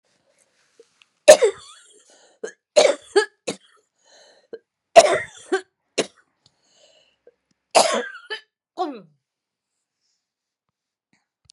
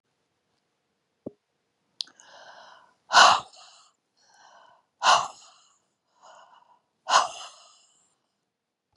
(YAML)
cough_length: 11.5 s
cough_amplitude: 32768
cough_signal_mean_std_ratio: 0.23
exhalation_length: 9.0 s
exhalation_amplitude: 26271
exhalation_signal_mean_std_ratio: 0.22
survey_phase: beta (2021-08-13 to 2022-03-07)
age: 65+
gender: Female
wearing_mask: 'No'
symptom_sore_throat: true
smoker_status: Ex-smoker
respiratory_condition_asthma: false
respiratory_condition_other: false
recruitment_source: Test and Trace
submission_delay: 1 day
covid_test_result: Negative
covid_test_method: RT-qPCR